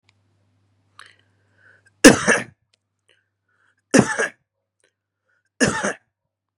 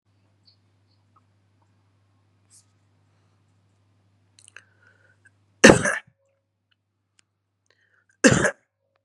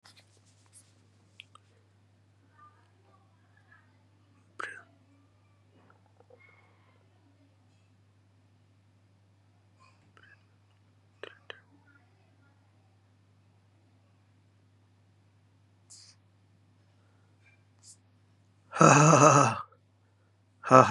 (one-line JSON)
{"three_cough_length": "6.6 s", "three_cough_amplitude": 32768, "three_cough_signal_mean_std_ratio": 0.23, "cough_length": "9.0 s", "cough_amplitude": 32768, "cough_signal_mean_std_ratio": 0.17, "exhalation_length": "20.9 s", "exhalation_amplitude": 25657, "exhalation_signal_mean_std_ratio": 0.18, "survey_phase": "beta (2021-08-13 to 2022-03-07)", "age": "18-44", "gender": "Male", "wearing_mask": "Yes", "symptom_cough_any": true, "symptom_sore_throat": true, "symptom_fever_high_temperature": true, "symptom_headache": true, "symptom_onset": "3 days", "smoker_status": "Never smoked", "respiratory_condition_asthma": false, "respiratory_condition_other": false, "recruitment_source": "Test and Trace", "submission_delay": "2 days", "covid_test_result": "Positive", "covid_test_method": "RT-qPCR", "covid_ct_value": 17.1, "covid_ct_gene": "ORF1ab gene", "covid_ct_mean": 18.5, "covid_viral_load": "830000 copies/ml", "covid_viral_load_category": "Low viral load (10K-1M copies/ml)"}